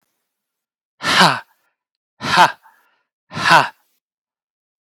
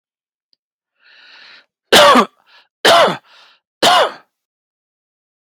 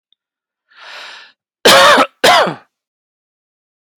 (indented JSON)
{
  "exhalation_length": "4.8 s",
  "exhalation_amplitude": 32767,
  "exhalation_signal_mean_std_ratio": 0.32,
  "three_cough_length": "5.6 s",
  "three_cough_amplitude": 32768,
  "three_cough_signal_mean_std_ratio": 0.35,
  "cough_length": "4.0 s",
  "cough_amplitude": 32768,
  "cough_signal_mean_std_ratio": 0.38,
  "survey_phase": "beta (2021-08-13 to 2022-03-07)",
  "age": "18-44",
  "gender": "Male",
  "wearing_mask": "No",
  "symptom_none": true,
  "smoker_status": "Never smoked",
  "respiratory_condition_asthma": false,
  "respiratory_condition_other": false,
  "recruitment_source": "REACT",
  "submission_delay": "1 day",
  "covid_test_result": "Negative",
  "covid_test_method": "RT-qPCR",
  "influenza_a_test_result": "Negative",
  "influenza_b_test_result": "Negative"
}